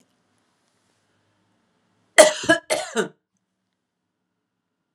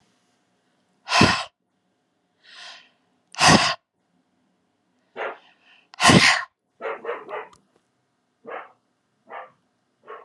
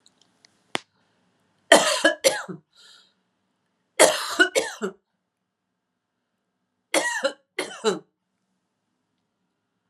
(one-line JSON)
{"cough_length": "4.9 s", "cough_amplitude": 32768, "cough_signal_mean_std_ratio": 0.21, "exhalation_length": "10.2 s", "exhalation_amplitude": 29275, "exhalation_signal_mean_std_ratio": 0.29, "three_cough_length": "9.9 s", "three_cough_amplitude": 32767, "three_cough_signal_mean_std_ratio": 0.29, "survey_phase": "beta (2021-08-13 to 2022-03-07)", "age": "65+", "gender": "Female", "wearing_mask": "No", "symptom_none": true, "smoker_status": "Ex-smoker", "respiratory_condition_asthma": false, "respiratory_condition_other": false, "recruitment_source": "REACT", "submission_delay": "4 days", "covid_test_result": "Negative", "covid_test_method": "RT-qPCR", "influenza_a_test_result": "Negative", "influenza_b_test_result": "Negative"}